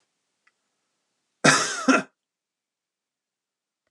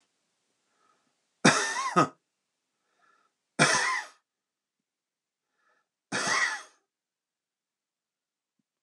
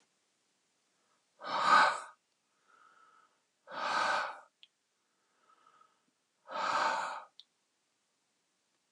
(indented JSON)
{
  "cough_length": "3.9 s",
  "cough_amplitude": 29921,
  "cough_signal_mean_std_ratio": 0.26,
  "three_cough_length": "8.8 s",
  "three_cough_amplitude": 17107,
  "three_cough_signal_mean_std_ratio": 0.3,
  "exhalation_length": "8.9 s",
  "exhalation_amplitude": 7963,
  "exhalation_signal_mean_std_ratio": 0.33,
  "survey_phase": "alpha (2021-03-01 to 2021-08-12)",
  "age": "45-64",
  "gender": "Male",
  "wearing_mask": "No",
  "symptom_none": true,
  "smoker_status": "Ex-smoker",
  "respiratory_condition_asthma": false,
  "respiratory_condition_other": false,
  "recruitment_source": "REACT",
  "submission_delay": "2 days",
  "covid_test_result": "Negative",
  "covid_test_method": "RT-qPCR"
}